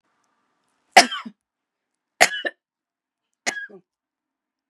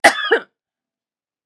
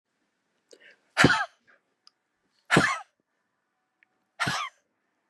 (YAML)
three_cough_length: 4.7 s
three_cough_amplitude: 32768
three_cough_signal_mean_std_ratio: 0.18
cough_length: 1.5 s
cough_amplitude: 32768
cough_signal_mean_std_ratio: 0.31
exhalation_length: 5.3 s
exhalation_amplitude: 21361
exhalation_signal_mean_std_ratio: 0.28
survey_phase: beta (2021-08-13 to 2022-03-07)
age: 45-64
gender: Female
wearing_mask: 'No'
symptom_cough_any: true
symptom_runny_or_blocked_nose: true
symptom_fatigue: true
symptom_onset: 3 days
smoker_status: Never smoked
respiratory_condition_asthma: false
respiratory_condition_other: false
recruitment_source: Test and Trace
submission_delay: 1 day
covid_test_result: Positive
covid_test_method: RT-qPCR
covid_ct_value: 15.4
covid_ct_gene: ORF1ab gene
covid_ct_mean: 15.6
covid_viral_load: 7400000 copies/ml
covid_viral_load_category: High viral load (>1M copies/ml)